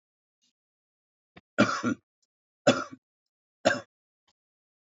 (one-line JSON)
{"three_cough_length": "4.9 s", "three_cough_amplitude": 13813, "three_cough_signal_mean_std_ratio": 0.25, "survey_phase": "beta (2021-08-13 to 2022-03-07)", "age": "65+", "gender": "Male", "wearing_mask": "No", "symptom_runny_or_blocked_nose": true, "symptom_headache": true, "smoker_status": "Ex-smoker", "respiratory_condition_asthma": false, "respiratory_condition_other": false, "recruitment_source": "Test and Trace", "submission_delay": "2 days", "covid_test_result": "Positive", "covid_test_method": "LFT"}